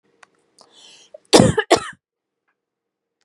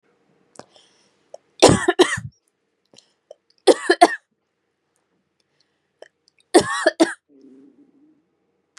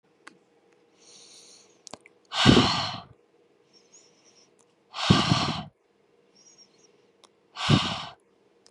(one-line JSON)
{"cough_length": "3.2 s", "cough_amplitude": 32768, "cough_signal_mean_std_ratio": 0.25, "three_cough_length": "8.8 s", "three_cough_amplitude": 32767, "three_cough_signal_mean_std_ratio": 0.25, "exhalation_length": "8.7 s", "exhalation_amplitude": 23325, "exhalation_signal_mean_std_ratio": 0.32, "survey_phase": "beta (2021-08-13 to 2022-03-07)", "age": "18-44", "gender": "Female", "wearing_mask": "No", "symptom_sore_throat": true, "symptom_fatigue": true, "symptom_headache": true, "smoker_status": "Prefer not to say", "respiratory_condition_asthma": false, "respiratory_condition_other": false, "recruitment_source": "Test and Trace", "submission_delay": "2 days", "covid_test_result": "Positive", "covid_test_method": "RT-qPCR", "covid_ct_value": 33.9, "covid_ct_gene": "ORF1ab gene", "covid_ct_mean": 33.9, "covid_viral_load": "7.5 copies/ml", "covid_viral_load_category": "Minimal viral load (< 10K copies/ml)"}